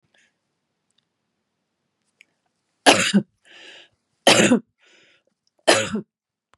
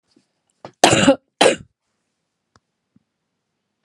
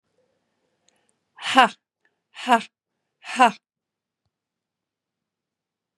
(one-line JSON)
{"three_cough_length": "6.6 s", "three_cough_amplitude": 32767, "three_cough_signal_mean_std_ratio": 0.28, "cough_length": "3.8 s", "cough_amplitude": 32768, "cough_signal_mean_std_ratio": 0.26, "exhalation_length": "6.0 s", "exhalation_amplitude": 32767, "exhalation_signal_mean_std_ratio": 0.2, "survey_phase": "beta (2021-08-13 to 2022-03-07)", "age": "45-64", "gender": "Female", "wearing_mask": "No", "symptom_runny_or_blocked_nose": true, "smoker_status": "Ex-smoker", "respiratory_condition_asthma": false, "respiratory_condition_other": false, "recruitment_source": "Test and Trace", "submission_delay": "1 day", "covid_test_result": "Positive", "covid_test_method": "RT-qPCR", "covid_ct_value": 24.1, "covid_ct_gene": "N gene"}